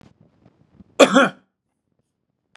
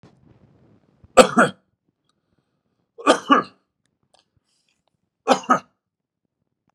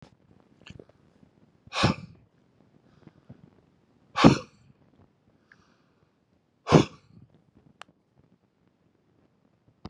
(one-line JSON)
{"cough_length": "2.6 s", "cough_amplitude": 32768, "cough_signal_mean_std_ratio": 0.24, "three_cough_length": "6.7 s", "three_cough_amplitude": 32768, "three_cough_signal_mean_std_ratio": 0.23, "exhalation_length": "9.9 s", "exhalation_amplitude": 30332, "exhalation_signal_mean_std_ratio": 0.18, "survey_phase": "beta (2021-08-13 to 2022-03-07)", "age": "65+", "gender": "Male", "wearing_mask": "No", "symptom_none": true, "smoker_status": "Never smoked", "respiratory_condition_asthma": false, "respiratory_condition_other": false, "recruitment_source": "REACT", "submission_delay": "1 day", "covid_test_result": "Negative", "covid_test_method": "RT-qPCR"}